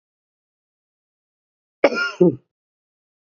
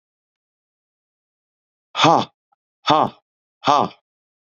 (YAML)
cough_length: 3.3 s
cough_amplitude: 26752
cough_signal_mean_std_ratio: 0.23
exhalation_length: 4.5 s
exhalation_amplitude: 28282
exhalation_signal_mean_std_ratio: 0.28
survey_phase: beta (2021-08-13 to 2022-03-07)
age: 45-64
gender: Male
wearing_mask: 'No'
symptom_cough_any: true
symptom_runny_or_blocked_nose: true
smoker_status: Never smoked
respiratory_condition_asthma: false
respiratory_condition_other: false
recruitment_source: Test and Trace
submission_delay: 1 day
covid_test_result: Negative
covid_test_method: RT-qPCR